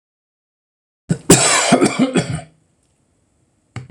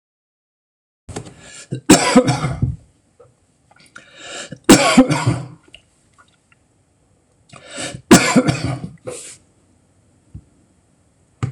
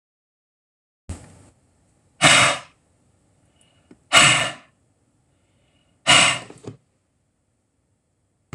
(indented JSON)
{
  "cough_length": "3.9 s",
  "cough_amplitude": 26028,
  "cough_signal_mean_std_ratio": 0.41,
  "three_cough_length": "11.5 s",
  "three_cough_amplitude": 26028,
  "three_cough_signal_mean_std_ratio": 0.33,
  "exhalation_length": "8.5 s",
  "exhalation_amplitude": 26028,
  "exhalation_signal_mean_std_ratio": 0.28,
  "survey_phase": "alpha (2021-03-01 to 2021-08-12)",
  "age": "65+",
  "gender": "Male",
  "wearing_mask": "No",
  "symptom_none": true,
  "smoker_status": "Ex-smoker",
  "respiratory_condition_asthma": false,
  "respiratory_condition_other": false,
  "recruitment_source": "REACT",
  "submission_delay": "2 days",
  "covid_test_result": "Negative",
  "covid_test_method": "RT-qPCR"
}